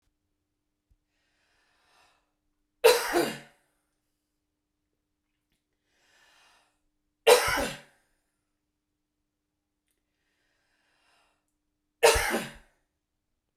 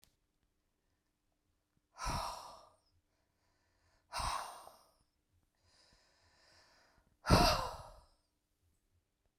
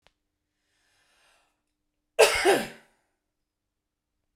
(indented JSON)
{
  "three_cough_length": "13.6 s",
  "three_cough_amplitude": 18708,
  "three_cough_signal_mean_std_ratio": 0.22,
  "exhalation_length": "9.4 s",
  "exhalation_amplitude": 7510,
  "exhalation_signal_mean_std_ratio": 0.25,
  "cough_length": "4.4 s",
  "cough_amplitude": 23020,
  "cough_signal_mean_std_ratio": 0.24,
  "survey_phase": "beta (2021-08-13 to 2022-03-07)",
  "age": "45-64",
  "gender": "Female",
  "wearing_mask": "No",
  "symptom_none": true,
  "symptom_onset": "4 days",
  "smoker_status": "Current smoker (e-cigarettes or vapes only)",
  "respiratory_condition_asthma": true,
  "respiratory_condition_other": false,
  "recruitment_source": "REACT",
  "submission_delay": "8 days",
  "covid_test_result": "Negative",
  "covid_test_method": "RT-qPCR"
}